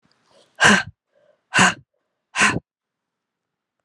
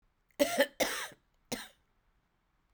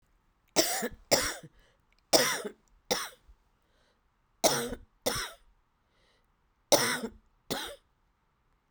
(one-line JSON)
{"exhalation_length": "3.8 s", "exhalation_amplitude": 31081, "exhalation_signal_mean_std_ratio": 0.31, "cough_length": "2.7 s", "cough_amplitude": 7812, "cough_signal_mean_std_ratio": 0.33, "three_cough_length": "8.7 s", "three_cough_amplitude": 20743, "three_cough_signal_mean_std_ratio": 0.35, "survey_phase": "alpha (2021-03-01 to 2021-08-12)", "age": "45-64", "gender": "Female", "wearing_mask": "No", "symptom_cough_any": true, "symptom_new_continuous_cough": true, "symptom_shortness_of_breath": true, "symptom_fatigue": true, "symptom_fever_high_temperature": true, "symptom_headache": true, "symptom_change_to_sense_of_smell_or_taste": true, "symptom_loss_of_taste": true, "symptom_onset": "4 days", "smoker_status": "Ex-smoker", "respiratory_condition_asthma": false, "respiratory_condition_other": false, "recruitment_source": "Test and Trace", "submission_delay": "1 day", "covid_test_result": "Positive", "covid_test_method": "RT-qPCR", "covid_ct_value": 20.1, "covid_ct_gene": "ORF1ab gene", "covid_ct_mean": 20.9, "covid_viral_load": "140000 copies/ml", "covid_viral_load_category": "Low viral load (10K-1M copies/ml)"}